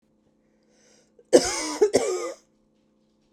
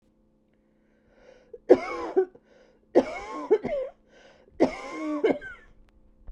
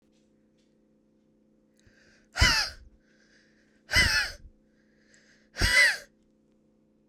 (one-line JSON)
{"cough_length": "3.3 s", "cough_amplitude": 32716, "cough_signal_mean_std_ratio": 0.33, "three_cough_length": "6.3 s", "three_cough_amplitude": 24577, "three_cough_signal_mean_std_ratio": 0.35, "exhalation_length": "7.1 s", "exhalation_amplitude": 12622, "exhalation_signal_mean_std_ratio": 0.32, "survey_phase": "beta (2021-08-13 to 2022-03-07)", "age": "45-64", "gender": "Female", "wearing_mask": "No", "symptom_runny_or_blocked_nose": true, "symptom_shortness_of_breath": true, "symptom_headache": true, "symptom_onset": "2 days", "smoker_status": "Ex-smoker", "respiratory_condition_asthma": true, "respiratory_condition_other": false, "recruitment_source": "Test and Trace", "submission_delay": "2 days", "covid_test_result": "Positive", "covid_test_method": "RT-qPCR", "covid_ct_value": 18.3, "covid_ct_gene": "ORF1ab gene", "covid_ct_mean": 18.6, "covid_viral_load": "790000 copies/ml", "covid_viral_load_category": "Low viral load (10K-1M copies/ml)"}